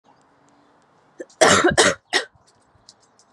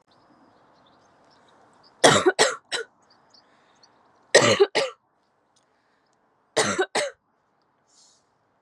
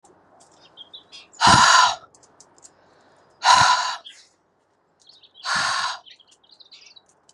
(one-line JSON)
{"cough_length": "3.3 s", "cough_amplitude": 32601, "cough_signal_mean_std_ratio": 0.34, "three_cough_length": "8.6 s", "three_cough_amplitude": 32186, "three_cough_signal_mean_std_ratio": 0.29, "exhalation_length": "7.3 s", "exhalation_amplitude": 30432, "exhalation_signal_mean_std_ratio": 0.36, "survey_phase": "beta (2021-08-13 to 2022-03-07)", "age": "18-44", "gender": "Female", "wearing_mask": "No", "symptom_cough_any": true, "symptom_runny_or_blocked_nose": true, "symptom_other": true, "symptom_onset": "5 days", "smoker_status": "Never smoked", "respiratory_condition_asthma": false, "respiratory_condition_other": false, "recruitment_source": "Test and Trace", "submission_delay": "2 days", "covid_test_result": "Positive", "covid_test_method": "RT-qPCR", "covid_ct_value": 17.7, "covid_ct_gene": "ORF1ab gene"}